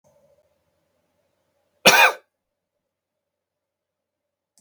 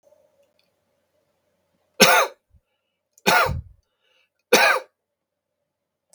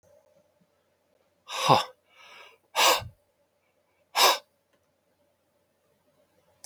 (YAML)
cough_length: 4.6 s
cough_amplitude: 32768
cough_signal_mean_std_ratio: 0.19
three_cough_length: 6.1 s
three_cough_amplitude: 32768
three_cough_signal_mean_std_ratio: 0.29
exhalation_length: 6.7 s
exhalation_amplitude: 21813
exhalation_signal_mean_std_ratio: 0.26
survey_phase: beta (2021-08-13 to 2022-03-07)
age: 45-64
gender: Male
wearing_mask: 'No'
symptom_other: true
smoker_status: Never smoked
respiratory_condition_asthma: true
respiratory_condition_other: false
recruitment_source: REACT
submission_delay: 1 day
covid_test_result: Negative
covid_test_method: RT-qPCR